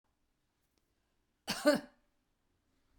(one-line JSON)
{"cough_length": "3.0 s", "cough_amplitude": 5823, "cough_signal_mean_std_ratio": 0.21, "survey_phase": "beta (2021-08-13 to 2022-03-07)", "age": "65+", "gender": "Female", "wearing_mask": "No", "symptom_none": true, "smoker_status": "Ex-smoker", "respiratory_condition_asthma": false, "respiratory_condition_other": false, "recruitment_source": "REACT", "submission_delay": "1 day", "covid_test_result": "Negative", "covid_test_method": "RT-qPCR", "covid_ct_value": 40.0, "covid_ct_gene": "N gene"}